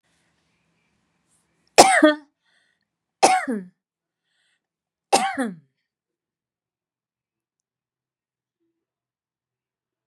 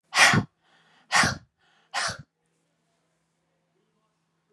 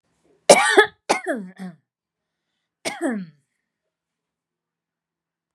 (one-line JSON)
{"three_cough_length": "10.1 s", "three_cough_amplitude": 32768, "three_cough_signal_mean_std_ratio": 0.22, "exhalation_length": "4.5 s", "exhalation_amplitude": 28048, "exhalation_signal_mean_std_ratio": 0.29, "cough_length": "5.5 s", "cough_amplitude": 32768, "cough_signal_mean_std_ratio": 0.26, "survey_phase": "beta (2021-08-13 to 2022-03-07)", "age": "65+", "gender": "Female", "wearing_mask": "No", "symptom_none": true, "smoker_status": "Ex-smoker", "respiratory_condition_asthma": false, "respiratory_condition_other": false, "recruitment_source": "REACT", "submission_delay": "3 days", "covid_test_result": "Negative", "covid_test_method": "RT-qPCR", "influenza_a_test_result": "Negative", "influenza_b_test_result": "Negative"}